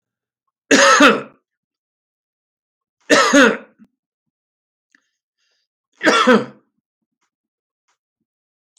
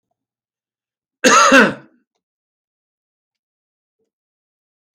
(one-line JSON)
{"three_cough_length": "8.8 s", "three_cough_amplitude": 32767, "three_cough_signal_mean_std_ratio": 0.31, "cough_length": "4.9 s", "cough_amplitude": 30296, "cough_signal_mean_std_ratio": 0.25, "survey_phase": "beta (2021-08-13 to 2022-03-07)", "age": "65+", "gender": "Male", "wearing_mask": "No", "symptom_none": true, "symptom_onset": "13 days", "smoker_status": "Ex-smoker", "respiratory_condition_asthma": false, "respiratory_condition_other": false, "recruitment_source": "REACT", "submission_delay": "1 day", "covid_test_result": "Negative", "covid_test_method": "RT-qPCR", "covid_ct_value": 41.0, "covid_ct_gene": "N gene"}